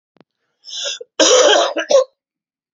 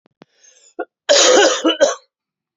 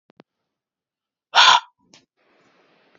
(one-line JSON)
{"cough_length": "2.7 s", "cough_amplitude": 32632, "cough_signal_mean_std_ratio": 0.48, "three_cough_length": "2.6 s", "three_cough_amplitude": 30951, "three_cough_signal_mean_std_ratio": 0.47, "exhalation_length": "3.0 s", "exhalation_amplitude": 30810, "exhalation_signal_mean_std_ratio": 0.23, "survey_phase": "beta (2021-08-13 to 2022-03-07)", "age": "18-44", "gender": "Male", "wearing_mask": "No", "symptom_cough_any": true, "symptom_new_continuous_cough": true, "symptom_runny_or_blocked_nose": true, "symptom_shortness_of_breath": true, "symptom_sore_throat": true, "symptom_fatigue": true, "symptom_fever_high_temperature": true, "symptom_headache": true, "symptom_onset": "4 days", "smoker_status": "Never smoked", "respiratory_condition_asthma": false, "respiratory_condition_other": false, "recruitment_source": "Test and Trace", "submission_delay": "2 days", "covid_test_result": "Positive", "covid_test_method": "RT-qPCR", "covid_ct_value": 22.5, "covid_ct_gene": "ORF1ab gene", "covid_ct_mean": 23.7, "covid_viral_load": "17000 copies/ml", "covid_viral_load_category": "Low viral load (10K-1M copies/ml)"}